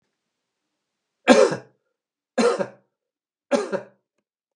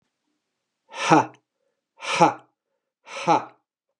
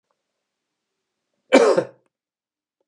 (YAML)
three_cough_length: 4.6 s
three_cough_amplitude: 32768
three_cough_signal_mean_std_ratio: 0.29
exhalation_length: 4.0 s
exhalation_amplitude: 26434
exhalation_signal_mean_std_ratio: 0.31
cough_length: 2.9 s
cough_amplitude: 31766
cough_signal_mean_std_ratio: 0.25
survey_phase: beta (2021-08-13 to 2022-03-07)
age: 45-64
gender: Male
wearing_mask: 'No'
symptom_none: true
smoker_status: Never smoked
respiratory_condition_asthma: false
respiratory_condition_other: false
recruitment_source: REACT
submission_delay: 2 days
covid_test_result: Negative
covid_test_method: RT-qPCR
influenza_a_test_result: Negative
influenza_b_test_result: Negative